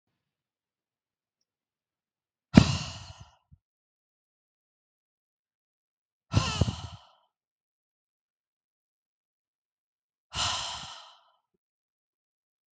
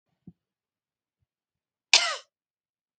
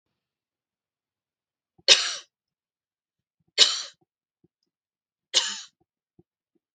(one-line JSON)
{"exhalation_length": "12.7 s", "exhalation_amplitude": 32768, "exhalation_signal_mean_std_ratio": 0.17, "cough_length": "3.0 s", "cough_amplitude": 32766, "cough_signal_mean_std_ratio": 0.17, "three_cough_length": "6.7 s", "three_cough_amplitude": 32768, "three_cough_signal_mean_std_ratio": 0.2, "survey_phase": "beta (2021-08-13 to 2022-03-07)", "age": "18-44", "gender": "Female", "wearing_mask": "No", "symptom_none": true, "symptom_onset": "9 days", "smoker_status": "Never smoked", "respiratory_condition_asthma": false, "respiratory_condition_other": false, "recruitment_source": "REACT", "submission_delay": "1 day", "covid_test_result": "Negative", "covid_test_method": "RT-qPCR", "influenza_a_test_result": "Negative", "influenza_b_test_result": "Negative"}